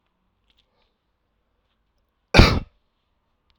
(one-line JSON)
{"cough_length": "3.6 s", "cough_amplitude": 32768, "cough_signal_mean_std_ratio": 0.18, "survey_phase": "alpha (2021-03-01 to 2021-08-12)", "age": "18-44", "gender": "Male", "wearing_mask": "No", "symptom_cough_any": true, "symptom_fatigue": true, "symptom_fever_high_temperature": true, "symptom_headache": true, "smoker_status": "Never smoked", "respiratory_condition_asthma": false, "respiratory_condition_other": false, "recruitment_source": "Test and Trace", "submission_delay": "2 days", "covid_test_result": "Positive", "covid_test_method": "RT-qPCR", "covid_ct_value": 20.7, "covid_ct_gene": "N gene"}